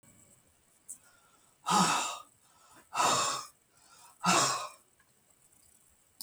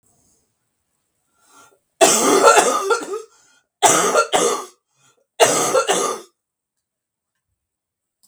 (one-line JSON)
{"exhalation_length": "6.2 s", "exhalation_amplitude": 7391, "exhalation_signal_mean_std_ratio": 0.4, "three_cough_length": "8.3 s", "three_cough_amplitude": 32768, "three_cough_signal_mean_std_ratio": 0.44, "survey_phase": "beta (2021-08-13 to 2022-03-07)", "age": "65+", "gender": "Female", "wearing_mask": "No", "symptom_cough_any": true, "symptom_onset": "2 days", "smoker_status": "Ex-smoker", "respiratory_condition_asthma": false, "respiratory_condition_other": false, "recruitment_source": "REACT", "submission_delay": "2 days", "covid_test_result": "Negative", "covid_test_method": "RT-qPCR", "influenza_a_test_result": "Negative", "influenza_b_test_result": "Negative"}